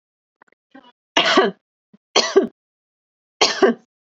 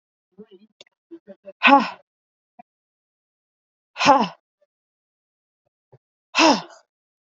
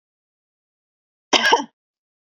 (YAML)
three_cough_length: 4.1 s
three_cough_amplitude: 31847
three_cough_signal_mean_std_ratio: 0.35
exhalation_length: 7.3 s
exhalation_amplitude: 27922
exhalation_signal_mean_std_ratio: 0.25
cough_length: 2.3 s
cough_amplitude: 32768
cough_signal_mean_std_ratio: 0.26
survey_phase: beta (2021-08-13 to 2022-03-07)
age: 18-44
gender: Female
wearing_mask: 'No'
symptom_none: true
smoker_status: Ex-smoker
respiratory_condition_asthma: false
respiratory_condition_other: false
recruitment_source: REACT
submission_delay: 1 day
covid_test_result: Negative
covid_test_method: RT-qPCR
influenza_a_test_result: Negative
influenza_b_test_result: Negative